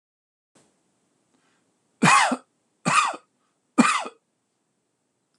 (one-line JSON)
{"three_cough_length": "5.4 s", "three_cough_amplitude": 25276, "three_cough_signal_mean_std_ratio": 0.31, "survey_phase": "alpha (2021-03-01 to 2021-08-12)", "age": "65+", "gender": "Male", "wearing_mask": "No", "symptom_none": true, "smoker_status": "Never smoked", "respiratory_condition_asthma": true, "respiratory_condition_other": false, "recruitment_source": "REACT", "submission_delay": "1 day", "covid_test_result": "Negative", "covid_test_method": "RT-qPCR"}